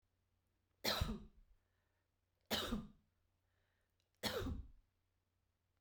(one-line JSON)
{"three_cough_length": "5.8 s", "three_cough_amplitude": 1819, "three_cough_signal_mean_std_ratio": 0.36, "survey_phase": "beta (2021-08-13 to 2022-03-07)", "age": "45-64", "gender": "Female", "wearing_mask": "No", "symptom_none": true, "smoker_status": "Never smoked", "respiratory_condition_asthma": false, "respiratory_condition_other": false, "recruitment_source": "REACT", "submission_delay": "1 day", "covid_test_result": "Positive", "covid_test_method": "RT-qPCR", "covid_ct_value": 36.0, "covid_ct_gene": "E gene", "influenza_a_test_result": "Negative", "influenza_b_test_result": "Negative"}